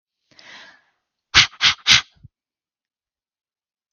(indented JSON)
{
  "exhalation_length": "3.9 s",
  "exhalation_amplitude": 32768,
  "exhalation_signal_mean_std_ratio": 0.24,
  "survey_phase": "beta (2021-08-13 to 2022-03-07)",
  "age": "18-44",
  "gender": "Female",
  "wearing_mask": "No",
  "symptom_cough_any": true,
  "smoker_status": "Never smoked",
  "respiratory_condition_asthma": false,
  "respiratory_condition_other": false,
  "recruitment_source": "REACT",
  "submission_delay": "0 days",
  "covid_test_result": "Negative",
  "covid_test_method": "RT-qPCR",
  "influenza_a_test_result": "Negative",
  "influenza_b_test_result": "Negative"
}